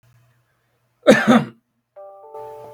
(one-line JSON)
{"cough_length": "2.7 s", "cough_amplitude": 32768, "cough_signal_mean_std_ratio": 0.31, "survey_phase": "beta (2021-08-13 to 2022-03-07)", "age": "18-44", "gender": "Male", "wearing_mask": "No", "symptom_runny_or_blocked_nose": true, "symptom_sore_throat": true, "smoker_status": "Ex-smoker", "respiratory_condition_asthma": false, "respiratory_condition_other": false, "recruitment_source": "Test and Trace", "submission_delay": "2 days", "covid_test_result": "Positive", "covid_test_method": "ePCR"}